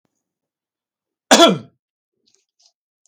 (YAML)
cough_length: 3.1 s
cough_amplitude: 32768
cough_signal_mean_std_ratio: 0.23
survey_phase: beta (2021-08-13 to 2022-03-07)
age: 65+
gender: Male
wearing_mask: 'No'
symptom_none: true
smoker_status: Never smoked
respiratory_condition_asthma: false
respiratory_condition_other: false
recruitment_source: REACT
submission_delay: 3 days
covid_test_result: Negative
covid_test_method: RT-qPCR
influenza_a_test_result: Unknown/Void
influenza_b_test_result: Unknown/Void